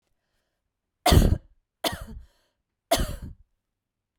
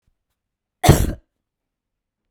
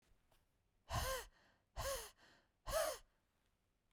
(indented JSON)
{
  "three_cough_length": "4.2 s",
  "three_cough_amplitude": 21667,
  "three_cough_signal_mean_std_ratio": 0.3,
  "cough_length": "2.3 s",
  "cough_amplitude": 32768,
  "cough_signal_mean_std_ratio": 0.24,
  "exhalation_length": "3.9 s",
  "exhalation_amplitude": 1257,
  "exhalation_signal_mean_std_ratio": 0.42,
  "survey_phase": "beta (2021-08-13 to 2022-03-07)",
  "age": "45-64",
  "gender": "Female",
  "wearing_mask": "No",
  "symptom_runny_or_blocked_nose": true,
  "symptom_shortness_of_breath": true,
  "symptom_sore_throat": true,
  "symptom_headache": true,
  "symptom_onset": "2 days",
  "smoker_status": "Never smoked",
  "respiratory_condition_asthma": false,
  "respiratory_condition_other": false,
  "recruitment_source": "Test and Trace",
  "submission_delay": "1 day",
  "covid_test_result": "Negative",
  "covid_test_method": "RT-qPCR"
}